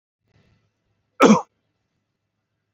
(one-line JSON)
{"cough_length": "2.7 s", "cough_amplitude": 26915, "cough_signal_mean_std_ratio": 0.21, "survey_phase": "beta (2021-08-13 to 2022-03-07)", "age": "45-64", "gender": "Male", "wearing_mask": "No", "symptom_none": true, "smoker_status": "Ex-smoker", "respiratory_condition_asthma": false, "respiratory_condition_other": false, "recruitment_source": "REACT", "submission_delay": "2 days", "covid_test_result": "Negative", "covid_test_method": "RT-qPCR", "influenza_a_test_result": "Negative", "influenza_b_test_result": "Negative"}